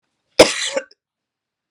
{"cough_length": "1.7 s", "cough_amplitude": 32768, "cough_signal_mean_std_ratio": 0.26, "survey_phase": "beta (2021-08-13 to 2022-03-07)", "age": "45-64", "gender": "Female", "wearing_mask": "No", "symptom_sore_throat": true, "smoker_status": "Never smoked", "respiratory_condition_asthma": false, "respiratory_condition_other": false, "recruitment_source": "REACT", "submission_delay": "5 days", "covid_test_result": "Negative", "covid_test_method": "RT-qPCR"}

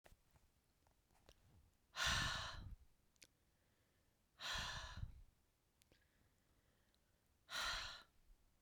{"exhalation_length": "8.6 s", "exhalation_amplitude": 1287, "exhalation_signal_mean_std_ratio": 0.4, "survey_phase": "beta (2021-08-13 to 2022-03-07)", "age": "45-64", "gender": "Female", "wearing_mask": "No", "symptom_cough_any": true, "symptom_runny_or_blocked_nose": true, "symptom_other": true, "symptom_onset": "3 days", "smoker_status": "Never smoked", "respiratory_condition_asthma": false, "respiratory_condition_other": false, "recruitment_source": "Test and Trace", "submission_delay": "1 day", "covid_test_result": "Positive", "covid_test_method": "RT-qPCR", "covid_ct_value": 38.3, "covid_ct_gene": "N gene"}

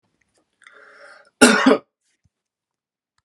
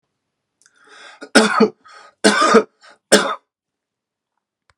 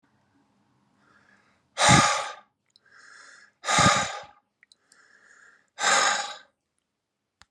{"cough_length": "3.2 s", "cough_amplitude": 32768, "cough_signal_mean_std_ratio": 0.25, "three_cough_length": "4.8 s", "three_cough_amplitude": 32768, "three_cough_signal_mean_std_ratio": 0.34, "exhalation_length": "7.5 s", "exhalation_amplitude": 23782, "exhalation_signal_mean_std_ratio": 0.35, "survey_phase": "alpha (2021-03-01 to 2021-08-12)", "age": "45-64", "gender": "Male", "wearing_mask": "No", "symptom_none": true, "smoker_status": "Ex-smoker", "respiratory_condition_asthma": false, "respiratory_condition_other": false, "recruitment_source": "REACT", "submission_delay": "5 days", "covid_test_result": "Negative", "covid_test_method": "RT-qPCR"}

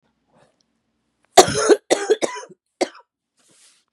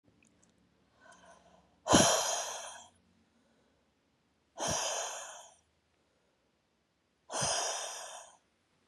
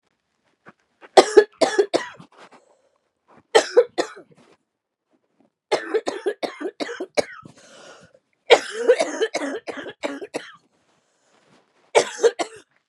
{"cough_length": "3.9 s", "cough_amplitude": 32768, "cough_signal_mean_std_ratio": 0.28, "exhalation_length": "8.9 s", "exhalation_amplitude": 12047, "exhalation_signal_mean_std_ratio": 0.35, "three_cough_length": "12.9 s", "three_cough_amplitude": 32768, "three_cough_signal_mean_std_ratio": 0.31, "survey_phase": "beta (2021-08-13 to 2022-03-07)", "age": "45-64", "gender": "Female", "wearing_mask": "No", "symptom_cough_any": true, "symptom_runny_or_blocked_nose": true, "symptom_onset": "8 days", "smoker_status": "Never smoked", "respiratory_condition_asthma": false, "respiratory_condition_other": false, "recruitment_source": "Test and Trace", "submission_delay": "1 day", "covid_test_result": "Positive", "covid_test_method": "RT-qPCR", "covid_ct_value": 26.6, "covid_ct_gene": "N gene"}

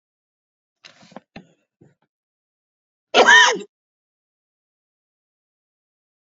{"cough_length": "6.4 s", "cough_amplitude": 29779, "cough_signal_mean_std_ratio": 0.2, "survey_phase": "beta (2021-08-13 to 2022-03-07)", "age": "45-64", "gender": "Male", "wearing_mask": "Yes", "symptom_none": true, "smoker_status": "Never smoked", "respiratory_condition_asthma": false, "respiratory_condition_other": false, "recruitment_source": "REACT", "submission_delay": "10 days", "covid_test_result": "Negative", "covid_test_method": "RT-qPCR", "influenza_a_test_result": "Negative", "influenza_b_test_result": "Negative"}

